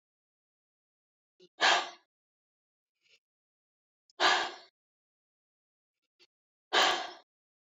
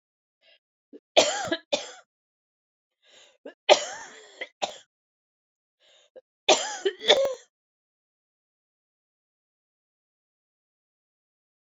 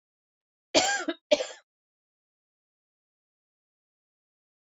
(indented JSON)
{
  "exhalation_length": "7.7 s",
  "exhalation_amplitude": 11223,
  "exhalation_signal_mean_std_ratio": 0.26,
  "three_cough_length": "11.6 s",
  "three_cough_amplitude": 25683,
  "three_cough_signal_mean_std_ratio": 0.23,
  "cough_length": "4.7 s",
  "cough_amplitude": 15510,
  "cough_signal_mean_std_ratio": 0.22,
  "survey_phase": "beta (2021-08-13 to 2022-03-07)",
  "age": "45-64",
  "gender": "Female",
  "wearing_mask": "No",
  "symptom_cough_any": true,
  "symptom_sore_throat": true,
  "smoker_status": "Never smoked",
  "respiratory_condition_asthma": false,
  "respiratory_condition_other": false,
  "recruitment_source": "REACT",
  "submission_delay": "1 day",
  "covid_test_result": "Negative",
  "covid_test_method": "RT-qPCR"
}